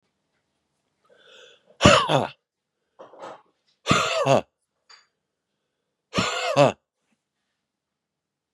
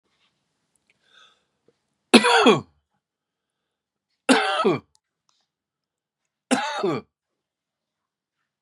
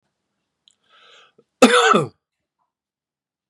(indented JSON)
{
  "exhalation_length": "8.5 s",
  "exhalation_amplitude": 30212,
  "exhalation_signal_mean_std_ratio": 0.3,
  "three_cough_length": "8.6 s",
  "three_cough_amplitude": 31876,
  "three_cough_signal_mean_std_ratio": 0.28,
  "cough_length": "3.5 s",
  "cough_amplitude": 32768,
  "cough_signal_mean_std_ratio": 0.27,
  "survey_phase": "beta (2021-08-13 to 2022-03-07)",
  "age": "45-64",
  "gender": "Male",
  "wearing_mask": "No",
  "symptom_none": true,
  "smoker_status": "Ex-smoker",
  "respiratory_condition_asthma": false,
  "respiratory_condition_other": false,
  "recruitment_source": "REACT",
  "submission_delay": "2 days",
  "covid_test_result": "Negative",
  "covid_test_method": "RT-qPCR",
  "influenza_a_test_result": "Negative",
  "influenza_b_test_result": "Negative"
}